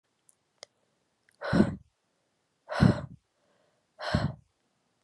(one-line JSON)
{"exhalation_length": "5.0 s", "exhalation_amplitude": 14363, "exhalation_signal_mean_std_ratio": 0.28, "survey_phase": "beta (2021-08-13 to 2022-03-07)", "age": "18-44", "gender": "Female", "wearing_mask": "No", "symptom_cough_any": true, "symptom_runny_or_blocked_nose": true, "symptom_shortness_of_breath": true, "symptom_sore_throat": true, "symptom_fatigue": true, "symptom_fever_high_temperature": true, "symptom_headache": true, "symptom_other": true, "smoker_status": "Never smoked", "respiratory_condition_asthma": false, "respiratory_condition_other": false, "recruitment_source": "Test and Trace", "submission_delay": "1 day", "covid_test_result": "Positive", "covid_test_method": "RT-qPCR"}